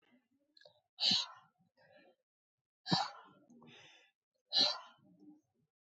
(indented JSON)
{
  "exhalation_length": "5.8 s",
  "exhalation_amplitude": 4606,
  "exhalation_signal_mean_std_ratio": 0.29,
  "survey_phase": "beta (2021-08-13 to 2022-03-07)",
  "age": "45-64",
  "gender": "Female",
  "wearing_mask": "No",
  "symptom_cough_any": true,
  "symptom_runny_or_blocked_nose": true,
  "symptom_sore_throat": true,
  "symptom_diarrhoea": true,
  "symptom_headache": true,
  "symptom_onset": "3 days",
  "smoker_status": "Never smoked",
  "respiratory_condition_asthma": false,
  "respiratory_condition_other": false,
  "recruitment_source": "Test and Trace",
  "submission_delay": "1 day",
  "covid_test_result": "Negative",
  "covid_test_method": "RT-qPCR"
}